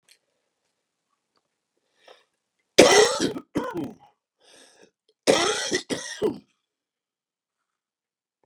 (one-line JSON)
{"cough_length": "8.5 s", "cough_amplitude": 32768, "cough_signal_mean_std_ratio": 0.28, "survey_phase": "beta (2021-08-13 to 2022-03-07)", "age": "65+", "gender": "Male", "wearing_mask": "No", "symptom_none": true, "smoker_status": "Ex-smoker", "respiratory_condition_asthma": false, "respiratory_condition_other": true, "recruitment_source": "REACT", "submission_delay": "0 days", "covid_test_result": "Negative", "covid_test_method": "RT-qPCR", "influenza_a_test_result": "Negative", "influenza_b_test_result": "Negative"}